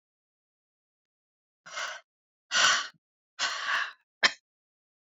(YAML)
exhalation_length: 5.0 s
exhalation_amplitude: 16851
exhalation_signal_mean_std_ratio: 0.33
survey_phase: beta (2021-08-13 to 2022-03-07)
age: 18-44
gender: Female
wearing_mask: 'No'
symptom_cough_any: true
symptom_runny_or_blocked_nose: true
symptom_shortness_of_breath: true
symptom_sore_throat: true
symptom_headache: true
symptom_change_to_sense_of_smell_or_taste: true
symptom_loss_of_taste: true
symptom_other: true
smoker_status: Ex-smoker
respiratory_condition_asthma: false
respiratory_condition_other: false
recruitment_source: Test and Trace
submission_delay: 2 days
covid_test_result: Positive
covid_test_method: RT-qPCR
covid_ct_value: 25.1
covid_ct_gene: N gene